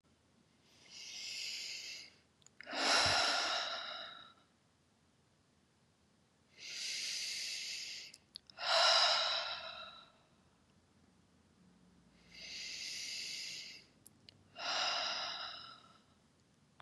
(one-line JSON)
{"exhalation_length": "16.8 s", "exhalation_amplitude": 4424, "exhalation_signal_mean_std_ratio": 0.49, "survey_phase": "beta (2021-08-13 to 2022-03-07)", "age": "45-64", "gender": "Female", "wearing_mask": "No", "symptom_none": true, "smoker_status": "Ex-smoker", "respiratory_condition_asthma": false, "respiratory_condition_other": false, "recruitment_source": "REACT", "submission_delay": "1 day", "covid_test_result": "Negative", "covid_test_method": "RT-qPCR", "influenza_a_test_result": "Negative", "influenza_b_test_result": "Negative"}